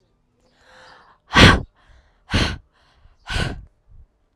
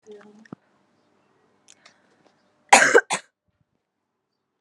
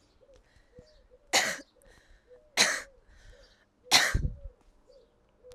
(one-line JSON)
{"exhalation_length": "4.4 s", "exhalation_amplitude": 32768, "exhalation_signal_mean_std_ratio": 0.28, "cough_length": "4.6 s", "cough_amplitude": 32768, "cough_signal_mean_std_ratio": 0.2, "three_cough_length": "5.5 s", "three_cough_amplitude": 19181, "three_cough_signal_mean_std_ratio": 0.32, "survey_phase": "alpha (2021-03-01 to 2021-08-12)", "age": "18-44", "gender": "Female", "wearing_mask": "No", "symptom_shortness_of_breath": true, "symptom_abdominal_pain": true, "symptom_diarrhoea": true, "symptom_fatigue": true, "symptom_fever_high_temperature": true, "symptom_headache": true, "smoker_status": "Current smoker (e-cigarettes or vapes only)", "respiratory_condition_asthma": true, "respiratory_condition_other": false, "recruitment_source": "Test and Trace", "submission_delay": "2 days", "covid_test_result": "Positive", "covid_test_method": "RT-qPCR", "covid_ct_value": 22.3, "covid_ct_gene": "ORF1ab gene", "covid_ct_mean": 23.6, "covid_viral_load": "18000 copies/ml", "covid_viral_load_category": "Low viral load (10K-1M copies/ml)"}